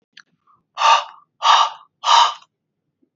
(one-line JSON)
{"exhalation_length": "3.2 s", "exhalation_amplitude": 28398, "exhalation_signal_mean_std_ratio": 0.41, "survey_phase": "beta (2021-08-13 to 2022-03-07)", "age": "18-44", "gender": "Male", "wearing_mask": "No", "symptom_none": true, "symptom_onset": "6 days", "smoker_status": "Never smoked", "respiratory_condition_asthma": false, "respiratory_condition_other": false, "recruitment_source": "REACT", "submission_delay": "3 days", "covid_test_result": "Negative", "covid_test_method": "RT-qPCR", "influenza_a_test_result": "Positive", "influenza_a_ct_value": 33.6, "influenza_b_test_result": "Negative"}